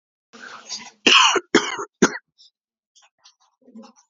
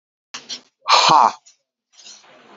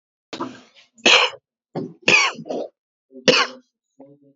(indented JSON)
{
  "cough_length": "4.1 s",
  "cough_amplitude": 29717,
  "cough_signal_mean_std_ratio": 0.32,
  "exhalation_length": "2.6 s",
  "exhalation_amplitude": 32767,
  "exhalation_signal_mean_std_ratio": 0.34,
  "three_cough_length": "4.4 s",
  "three_cough_amplitude": 30199,
  "three_cough_signal_mean_std_ratio": 0.37,
  "survey_phase": "beta (2021-08-13 to 2022-03-07)",
  "age": "45-64",
  "gender": "Male",
  "wearing_mask": "No",
  "symptom_cough_any": true,
  "symptom_runny_or_blocked_nose": true,
  "symptom_change_to_sense_of_smell_or_taste": true,
  "symptom_loss_of_taste": true,
  "smoker_status": "Ex-smoker",
  "respiratory_condition_asthma": false,
  "respiratory_condition_other": false,
  "recruitment_source": "Test and Trace",
  "submission_delay": "2 days",
  "covid_test_result": "Positive",
  "covid_test_method": "ePCR"
}